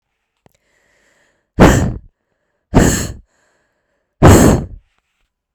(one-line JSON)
{"exhalation_length": "5.5 s", "exhalation_amplitude": 32768, "exhalation_signal_mean_std_ratio": 0.35, "survey_phase": "beta (2021-08-13 to 2022-03-07)", "age": "18-44", "gender": "Female", "wearing_mask": "No", "symptom_cough_any": true, "symptom_runny_or_blocked_nose": true, "symptom_diarrhoea": true, "symptom_headache": true, "symptom_loss_of_taste": true, "smoker_status": "Never smoked", "respiratory_condition_asthma": true, "respiratory_condition_other": false, "recruitment_source": "Test and Trace", "submission_delay": "3 days", "covid_test_result": "Positive", "covid_test_method": "RT-qPCR", "covid_ct_value": 28.4, "covid_ct_gene": "ORF1ab gene", "covid_ct_mean": 29.2, "covid_viral_load": "270 copies/ml", "covid_viral_load_category": "Minimal viral load (< 10K copies/ml)"}